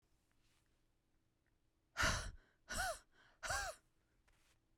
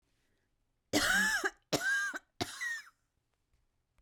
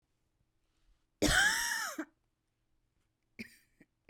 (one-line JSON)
{"exhalation_length": "4.8 s", "exhalation_amplitude": 2165, "exhalation_signal_mean_std_ratio": 0.36, "three_cough_length": "4.0 s", "three_cough_amplitude": 4972, "three_cough_signal_mean_std_ratio": 0.48, "cough_length": "4.1 s", "cough_amplitude": 5085, "cough_signal_mean_std_ratio": 0.34, "survey_phase": "beta (2021-08-13 to 2022-03-07)", "age": "18-44", "gender": "Female", "wearing_mask": "No", "symptom_cough_any": true, "symptom_new_continuous_cough": true, "symptom_shortness_of_breath": true, "symptom_sore_throat": true, "symptom_onset": "2 days", "smoker_status": "Never smoked", "respiratory_condition_asthma": false, "respiratory_condition_other": false, "recruitment_source": "Test and Trace", "submission_delay": "1 day", "covid_test_result": "Negative", "covid_test_method": "RT-qPCR"}